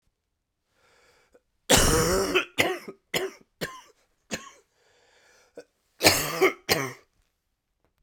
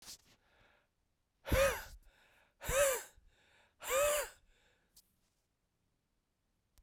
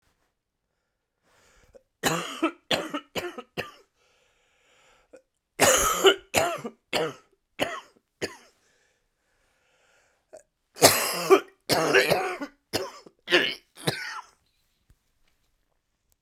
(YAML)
cough_length: 8.0 s
cough_amplitude: 30611
cough_signal_mean_std_ratio: 0.37
exhalation_length: 6.8 s
exhalation_amplitude: 3506
exhalation_signal_mean_std_ratio: 0.34
three_cough_length: 16.2 s
three_cough_amplitude: 29368
three_cough_signal_mean_std_ratio: 0.35
survey_phase: beta (2021-08-13 to 2022-03-07)
age: 45-64
gender: Male
wearing_mask: 'No'
symptom_cough_any: true
symptom_runny_or_blocked_nose: true
symptom_sore_throat: true
symptom_fatigue: true
symptom_headache: true
symptom_change_to_sense_of_smell_or_taste: true
symptom_loss_of_taste: true
symptom_onset: 3 days
smoker_status: Never smoked
respiratory_condition_asthma: false
respiratory_condition_other: false
recruitment_source: Test and Trace
submission_delay: 1 day
covid_test_result: Positive
covid_test_method: RT-qPCR
covid_ct_value: 14.5
covid_ct_gene: ORF1ab gene
covid_ct_mean: 15.0
covid_viral_load: 12000000 copies/ml
covid_viral_load_category: High viral load (>1M copies/ml)